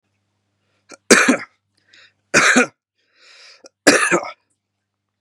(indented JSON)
{
  "three_cough_length": "5.2 s",
  "three_cough_amplitude": 32768,
  "three_cough_signal_mean_std_ratio": 0.33,
  "survey_phase": "beta (2021-08-13 to 2022-03-07)",
  "age": "18-44",
  "gender": "Male",
  "wearing_mask": "No",
  "symptom_none": true,
  "smoker_status": "Current smoker (11 or more cigarettes per day)",
  "respiratory_condition_asthma": false,
  "respiratory_condition_other": false,
  "recruitment_source": "REACT",
  "submission_delay": "7 days",
  "covid_test_result": "Negative",
  "covid_test_method": "RT-qPCR",
  "influenza_a_test_result": "Negative",
  "influenza_b_test_result": "Negative"
}